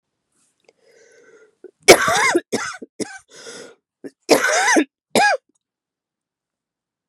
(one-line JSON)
{"cough_length": "7.1 s", "cough_amplitude": 32768, "cough_signal_mean_std_ratio": 0.34, "survey_phase": "beta (2021-08-13 to 2022-03-07)", "age": "45-64", "gender": "Female", "wearing_mask": "No", "symptom_cough_any": true, "symptom_runny_or_blocked_nose": true, "symptom_sore_throat": true, "symptom_abdominal_pain": true, "symptom_diarrhoea": true, "symptom_fatigue": true, "symptom_other": true, "symptom_onset": "3 days", "smoker_status": "Ex-smoker", "respiratory_condition_asthma": false, "respiratory_condition_other": false, "recruitment_source": "Test and Trace", "submission_delay": "1 day", "covid_test_result": "Positive", "covid_test_method": "ePCR"}